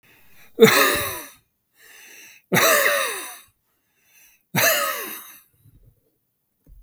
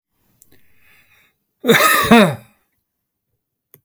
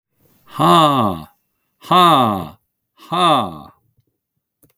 three_cough_length: 6.8 s
three_cough_amplitude: 32768
three_cough_signal_mean_std_ratio: 0.4
cough_length: 3.8 s
cough_amplitude: 32768
cough_signal_mean_std_ratio: 0.33
exhalation_length: 4.8 s
exhalation_amplitude: 32766
exhalation_signal_mean_std_ratio: 0.46
survey_phase: beta (2021-08-13 to 2022-03-07)
age: 65+
gender: Male
wearing_mask: 'No'
symptom_none: true
smoker_status: Never smoked
respiratory_condition_asthma: false
respiratory_condition_other: false
recruitment_source: REACT
submission_delay: 8 days
covid_test_result: Negative
covid_test_method: RT-qPCR
influenza_a_test_result: Negative
influenza_b_test_result: Negative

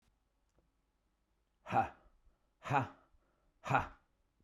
exhalation_length: 4.4 s
exhalation_amplitude: 4856
exhalation_signal_mean_std_ratio: 0.28
survey_phase: beta (2021-08-13 to 2022-03-07)
age: 18-44
gender: Male
wearing_mask: 'No'
symptom_sore_throat: true
smoker_status: Never smoked
respiratory_condition_asthma: false
respiratory_condition_other: false
recruitment_source: REACT
submission_delay: 1 day
covid_test_result: Negative
covid_test_method: RT-qPCR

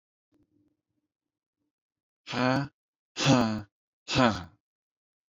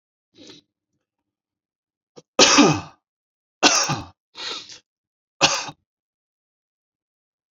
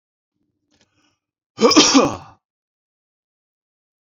exhalation_length: 5.3 s
exhalation_amplitude: 14048
exhalation_signal_mean_std_ratio: 0.33
three_cough_length: 7.5 s
three_cough_amplitude: 32767
three_cough_signal_mean_std_ratio: 0.28
cough_length: 4.0 s
cough_amplitude: 32421
cough_signal_mean_std_ratio: 0.28
survey_phase: beta (2021-08-13 to 2022-03-07)
age: 18-44
gender: Male
wearing_mask: 'No'
symptom_fatigue: true
smoker_status: Never smoked
respiratory_condition_asthma: false
respiratory_condition_other: false
recruitment_source: REACT
submission_delay: 2 days
covid_test_result: Negative
covid_test_method: RT-qPCR
influenza_a_test_result: Negative
influenza_b_test_result: Negative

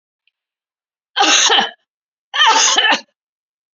cough_length: 3.8 s
cough_amplitude: 32623
cough_signal_mean_std_ratio: 0.47
survey_phase: beta (2021-08-13 to 2022-03-07)
age: 65+
gender: Female
wearing_mask: 'No'
symptom_none: true
smoker_status: Never smoked
respiratory_condition_asthma: true
respiratory_condition_other: false
recruitment_source: REACT
submission_delay: 1 day
covid_test_result: Negative
covid_test_method: RT-qPCR
influenza_a_test_result: Negative
influenza_b_test_result: Negative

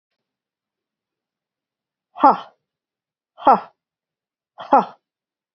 exhalation_length: 5.5 s
exhalation_amplitude: 29519
exhalation_signal_mean_std_ratio: 0.21
survey_phase: beta (2021-08-13 to 2022-03-07)
age: 45-64
gender: Female
wearing_mask: 'No'
symptom_none: true
smoker_status: Ex-smoker
respiratory_condition_asthma: false
respiratory_condition_other: false
recruitment_source: REACT
submission_delay: 1 day
covid_test_result: Negative
covid_test_method: RT-qPCR
influenza_a_test_result: Negative
influenza_b_test_result: Negative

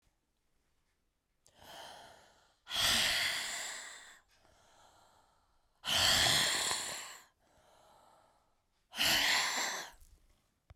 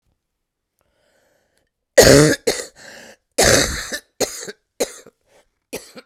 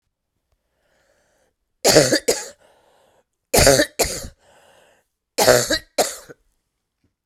exhalation_length: 10.8 s
exhalation_amplitude: 6281
exhalation_signal_mean_std_ratio: 0.46
cough_length: 6.1 s
cough_amplitude: 32768
cough_signal_mean_std_ratio: 0.32
three_cough_length: 7.3 s
three_cough_amplitude: 32768
three_cough_signal_mean_std_ratio: 0.34
survey_phase: beta (2021-08-13 to 2022-03-07)
age: 45-64
gender: Female
wearing_mask: 'No'
symptom_cough_any: true
symptom_runny_or_blocked_nose: true
symptom_sore_throat: true
symptom_diarrhoea: true
symptom_fatigue: true
symptom_headache: true
symptom_onset: 3 days
smoker_status: Current smoker (11 or more cigarettes per day)
respiratory_condition_asthma: false
respiratory_condition_other: true
recruitment_source: Test and Trace
submission_delay: 2 days
covid_test_result: Positive
covid_test_method: RT-qPCR
covid_ct_value: 23.1
covid_ct_gene: ORF1ab gene
covid_ct_mean: 23.9
covid_viral_load: 14000 copies/ml
covid_viral_load_category: Low viral load (10K-1M copies/ml)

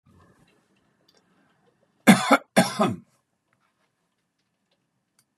cough_length: 5.4 s
cough_amplitude: 30862
cough_signal_mean_std_ratio: 0.23
survey_phase: beta (2021-08-13 to 2022-03-07)
age: 65+
gender: Male
wearing_mask: 'No'
symptom_none: true
smoker_status: Never smoked
respiratory_condition_asthma: false
respiratory_condition_other: false
recruitment_source: REACT
submission_delay: 2 days
covid_test_result: Negative
covid_test_method: RT-qPCR
influenza_a_test_result: Negative
influenza_b_test_result: Negative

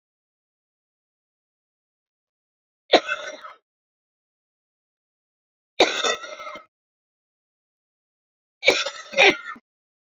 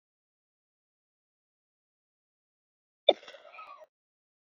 three_cough_length: 10.1 s
three_cough_amplitude: 32308
three_cough_signal_mean_std_ratio: 0.23
cough_length: 4.4 s
cough_amplitude: 17985
cough_signal_mean_std_ratio: 0.09
survey_phase: beta (2021-08-13 to 2022-03-07)
age: 45-64
gender: Female
wearing_mask: 'No'
symptom_cough_any: true
symptom_runny_or_blocked_nose: true
symptom_shortness_of_breath: true
symptom_diarrhoea: true
symptom_fatigue: true
symptom_change_to_sense_of_smell_or_taste: true
symptom_loss_of_taste: true
smoker_status: Current smoker (1 to 10 cigarettes per day)
respiratory_condition_asthma: true
respiratory_condition_other: true
recruitment_source: Test and Trace
submission_delay: 2 days
covid_test_result: Positive
covid_test_method: RT-qPCR
covid_ct_value: 14.9
covid_ct_gene: ORF1ab gene
covid_ct_mean: 15.4
covid_viral_load: 9200000 copies/ml
covid_viral_load_category: High viral load (>1M copies/ml)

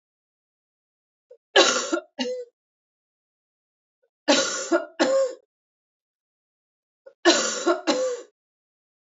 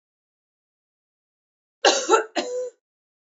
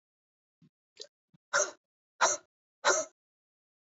three_cough_length: 9.0 s
three_cough_amplitude: 25894
three_cough_signal_mean_std_ratio: 0.38
cough_length: 3.3 s
cough_amplitude: 26776
cough_signal_mean_std_ratio: 0.31
exhalation_length: 3.8 s
exhalation_amplitude: 8453
exhalation_signal_mean_std_ratio: 0.28
survey_phase: beta (2021-08-13 to 2022-03-07)
age: 18-44
gender: Female
wearing_mask: 'No'
symptom_cough_any: true
symptom_new_continuous_cough: true
symptom_runny_or_blocked_nose: true
symptom_sore_throat: true
symptom_fatigue: true
symptom_headache: true
symptom_change_to_sense_of_smell_or_taste: true
symptom_loss_of_taste: true
symptom_onset: 5 days
smoker_status: Never smoked
respiratory_condition_asthma: false
respiratory_condition_other: false
recruitment_source: Test and Trace
submission_delay: 1 day
covid_test_result: Negative
covid_test_method: ePCR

